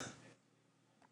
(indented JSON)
{
  "cough_length": "1.1 s",
  "cough_amplitude": 580,
  "cough_signal_mean_std_ratio": 0.46,
  "survey_phase": "beta (2021-08-13 to 2022-03-07)",
  "age": "45-64",
  "gender": "Female",
  "wearing_mask": "No",
  "symptom_none": true,
  "smoker_status": "Never smoked",
  "respiratory_condition_asthma": true,
  "respiratory_condition_other": false,
  "recruitment_source": "REACT",
  "submission_delay": "16 days",
  "covid_test_result": "Negative",
  "covid_test_method": "RT-qPCR",
  "influenza_a_test_result": "Negative",
  "influenza_b_test_result": "Negative"
}